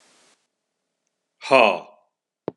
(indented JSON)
{
  "exhalation_length": "2.6 s",
  "exhalation_amplitude": 30625,
  "exhalation_signal_mean_std_ratio": 0.24,
  "survey_phase": "beta (2021-08-13 to 2022-03-07)",
  "age": "45-64",
  "gender": "Male",
  "wearing_mask": "No",
  "symptom_none": true,
  "smoker_status": "Current smoker (1 to 10 cigarettes per day)",
  "respiratory_condition_asthma": false,
  "respiratory_condition_other": false,
  "recruitment_source": "REACT",
  "submission_delay": "3 days",
  "covid_test_result": "Negative",
  "covid_test_method": "RT-qPCR",
  "influenza_a_test_result": "Negative",
  "influenza_b_test_result": "Negative"
}